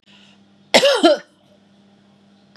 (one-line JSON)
{"cough_length": "2.6 s", "cough_amplitude": 32768, "cough_signal_mean_std_ratio": 0.33, "survey_phase": "beta (2021-08-13 to 2022-03-07)", "age": "45-64", "gender": "Female", "wearing_mask": "No", "symptom_none": true, "smoker_status": "Never smoked", "respiratory_condition_asthma": false, "respiratory_condition_other": false, "recruitment_source": "REACT", "submission_delay": "1 day", "covid_test_result": "Negative", "covid_test_method": "RT-qPCR", "influenza_a_test_result": "Negative", "influenza_b_test_result": "Negative"}